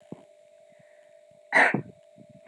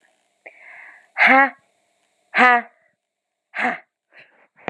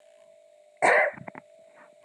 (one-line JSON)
{"cough_length": "2.5 s", "cough_amplitude": 16406, "cough_signal_mean_std_ratio": 0.29, "exhalation_length": "4.7 s", "exhalation_amplitude": 31509, "exhalation_signal_mean_std_ratio": 0.31, "three_cough_length": "2.0 s", "three_cough_amplitude": 11737, "three_cough_signal_mean_std_ratio": 0.35, "survey_phase": "beta (2021-08-13 to 2022-03-07)", "age": "18-44", "gender": "Female", "wearing_mask": "No", "symptom_runny_or_blocked_nose": true, "symptom_sore_throat": true, "symptom_diarrhoea": true, "symptom_fatigue": true, "symptom_onset": "4 days", "smoker_status": "Never smoked", "respiratory_condition_asthma": false, "respiratory_condition_other": false, "recruitment_source": "Test and Trace", "submission_delay": "2 days", "covid_test_result": "Positive", "covid_test_method": "RT-qPCR", "covid_ct_value": 31.4, "covid_ct_gene": "ORF1ab gene"}